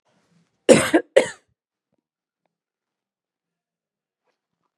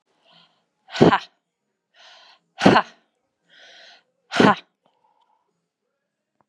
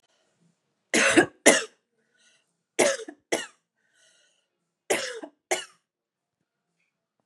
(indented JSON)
{
  "cough_length": "4.8 s",
  "cough_amplitude": 32768,
  "cough_signal_mean_std_ratio": 0.19,
  "exhalation_length": "6.5 s",
  "exhalation_amplitude": 32768,
  "exhalation_signal_mean_std_ratio": 0.23,
  "three_cough_length": "7.3 s",
  "three_cough_amplitude": 31788,
  "three_cough_signal_mean_std_ratio": 0.28,
  "survey_phase": "beta (2021-08-13 to 2022-03-07)",
  "age": "45-64",
  "gender": "Female",
  "wearing_mask": "No",
  "symptom_none": true,
  "smoker_status": "Ex-smoker",
  "respiratory_condition_asthma": false,
  "respiratory_condition_other": false,
  "recruitment_source": "REACT",
  "submission_delay": "1 day",
  "covid_test_result": "Negative",
  "covid_test_method": "RT-qPCR",
  "influenza_a_test_result": "Negative",
  "influenza_b_test_result": "Negative"
}